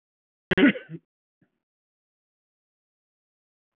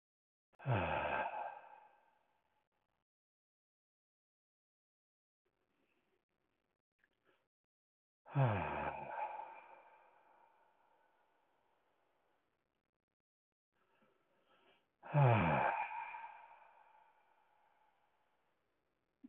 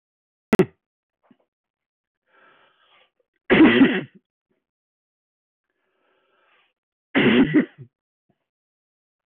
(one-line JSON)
{"cough_length": "3.8 s", "cough_amplitude": 12920, "cough_signal_mean_std_ratio": 0.18, "exhalation_length": "19.3 s", "exhalation_amplitude": 3815, "exhalation_signal_mean_std_ratio": 0.3, "three_cough_length": "9.4 s", "three_cough_amplitude": 18257, "three_cough_signal_mean_std_ratio": 0.27, "survey_phase": "alpha (2021-03-01 to 2021-08-12)", "age": "45-64", "gender": "Male", "wearing_mask": "No", "symptom_none": true, "smoker_status": "Never smoked", "respiratory_condition_asthma": false, "respiratory_condition_other": false, "recruitment_source": "REACT", "submission_delay": "1 day", "covid_test_result": "Negative", "covid_test_method": "RT-qPCR"}